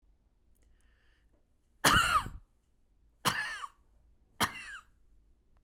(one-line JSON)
{"cough_length": "5.6 s", "cough_amplitude": 10535, "cough_signal_mean_std_ratio": 0.32, "survey_phase": "beta (2021-08-13 to 2022-03-07)", "age": "45-64", "gender": "Female", "wearing_mask": "No", "symptom_none": true, "smoker_status": "Never smoked", "respiratory_condition_asthma": true, "respiratory_condition_other": false, "recruitment_source": "REACT", "submission_delay": "1 day", "covid_test_result": "Negative", "covid_test_method": "RT-qPCR"}